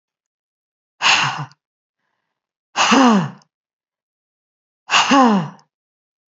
{
  "exhalation_length": "6.4 s",
  "exhalation_amplitude": 30032,
  "exhalation_signal_mean_std_ratio": 0.38,
  "survey_phase": "beta (2021-08-13 to 2022-03-07)",
  "age": "45-64",
  "gender": "Female",
  "wearing_mask": "No",
  "symptom_none": true,
  "smoker_status": "Never smoked",
  "respiratory_condition_asthma": false,
  "respiratory_condition_other": false,
  "recruitment_source": "Test and Trace",
  "submission_delay": "0 days",
  "covid_test_result": "Negative",
  "covid_test_method": "LFT"
}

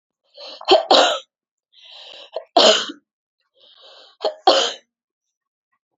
{
  "three_cough_length": "6.0 s",
  "three_cough_amplitude": 30647,
  "three_cough_signal_mean_std_ratio": 0.34,
  "survey_phase": "beta (2021-08-13 to 2022-03-07)",
  "age": "45-64",
  "gender": "Female",
  "wearing_mask": "No",
  "symptom_cough_any": true,
  "symptom_runny_or_blocked_nose": true,
  "symptom_headache": true,
  "symptom_onset": "6 days",
  "smoker_status": "Never smoked",
  "respiratory_condition_asthma": false,
  "respiratory_condition_other": false,
  "recruitment_source": "Test and Trace",
  "submission_delay": "2 days",
  "covid_test_result": "Positive",
  "covid_test_method": "RT-qPCR",
  "covid_ct_value": 24.2,
  "covid_ct_gene": "N gene"
}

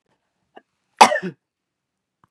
{
  "cough_length": "2.3 s",
  "cough_amplitude": 32768,
  "cough_signal_mean_std_ratio": 0.19,
  "survey_phase": "beta (2021-08-13 to 2022-03-07)",
  "age": "45-64",
  "gender": "Female",
  "wearing_mask": "No",
  "symptom_none": true,
  "smoker_status": "Never smoked",
  "respiratory_condition_asthma": false,
  "respiratory_condition_other": false,
  "recruitment_source": "REACT",
  "submission_delay": "1 day",
  "covid_test_result": "Negative",
  "covid_test_method": "RT-qPCR",
  "influenza_a_test_result": "Negative",
  "influenza_b_test_result": "Negative"
}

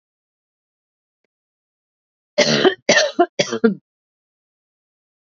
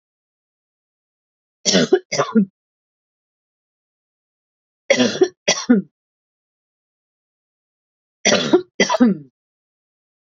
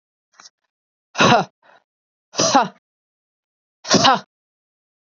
{
  "cough_length": "5.3 s",
  "cough_amplitude": 30527,
  "cough_signal_mean_std_ratio": 0.3,
  "three_cough_length": "10.3 s",
  "three_cough_amplitude": 30495,
  "three_cough_signal_mean_std_ratio": 0.32,
  "exhalation_length": "5.0 s",
  "exhalation_amplitude": 29261,
  "exhalation_signal_mean_std_ratio": 0.32,
  "survey_phase": "beta (2021-08-13 to 2022-03-07)",
  "age": "45-64",
  "gender": "Female",
  "wearing_mask": "No",
  "symptom_fatigue": true,
  "smoker_status": "Never smoked",
  "respiratory_condition_asthma": false,
  "respiratory_condition_other": false,
  "recruitment_source": "Test and Trace",
  "submission_delay": "1 day",
  "covid_test_result": "Positive",
  "covid_test_method": "ePCR"
}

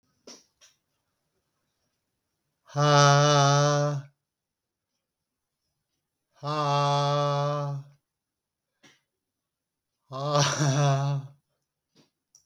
{
  "exhalation_length": "12.5 s",
  "exhalation_amplitude": 16933,
  "exhalation_signal_mean_std_ratio": 0.44,
  "survey_phase": "beta (2021-08-13 to 2022-03-07)",
  "age": "45-64",
  "gender": "Male",
  "wearing_mask": "No",
  "symptom_none": true,
  "smoker_status": "Ex-smoker",
  "respiratory_condition_asthma": false,
  "respiratory_condition_other": false,
  "recruitment_source": "REACT",
  "submission_delay": "2 days",
  "covid_test_result": "Negative",
  "covid_test_method": "RT-qPCR",
  "influenza_a_test_result": "Negative",
  "influenza_b_test_result": "Negative"
}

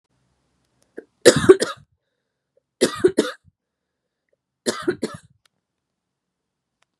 {
  "three_cough_length": "7.0 s",
  "three_cough_amplitude": 32768,
  "three_cough_signal_mean_std_ratio": 0.22,
  "survey_phase": "beta (2021-08-13 to 2022-03-07)",
  "age": "18-44",
  "gender": "Female",
  "wearing_mask": "No",
  "symptom_cough_any": true,
  "symptom_runny_or_blocked_nose": true,
  "symptom_abdominal_pain": true,
  "symptom_headache": true,
  "symptom_other": true,
  "smoker_status": "Never smoked",
  "respiratory_condition_asthma": true,
  "respiratory_condition_other": false,
  "recruitment_source": "Test and Trace",
  "submission_delay": "1 day",
  "covid_test_result": "Positive",
  "covid_test_method": "RT-qPCR",
  "covid_ct_value": 28.9,
  "covid_ct_gene": "ORF1ab gene",
  "covid_ct_mean": 29.8,
  "covid_viral_load": "170 copies/ml",
  "covid_viral_load_category": "Minimal viral load (< 10K copies/ml)"
}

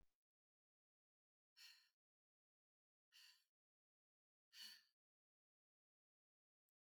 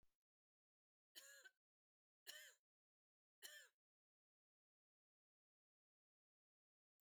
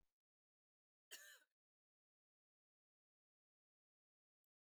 {
  "exhalation_length": "6.9 s",
  "exhalation_amplitude": 150,
  "exhalation_signal_mean_std_ratio": 0.25,
  "three_cough_length": "7.2 s",
  "three_cough_amplitude": 285,
  "three_cough_signal_mean_std_ratio": 0.25,
  "cough_length": "4.6 s",
  "cough_amplitude": 275,
  "cough_signal_mean_std_ratio": 0.18,
  "survey_phase": "beta (2021-08-13 to 2022-03-07)",
  "age": "65+",
  "gender": "Female",
  "wearing_mask": "No",
  "symptom_none": true,
  "smoker_status": "Never smoked",
  "respiratory_condition_asthma": false,
  "respiratory_condition_other": false,
  "recruitment_source": "REACT",
  "submission_delay": "2 days",
  "covid_test_result": "Negative",
  "covid_test_method": "RT-qPCR",
  "influenza_a_test_result": "Negative",
  "influenza_b_test_result": "Negative"
}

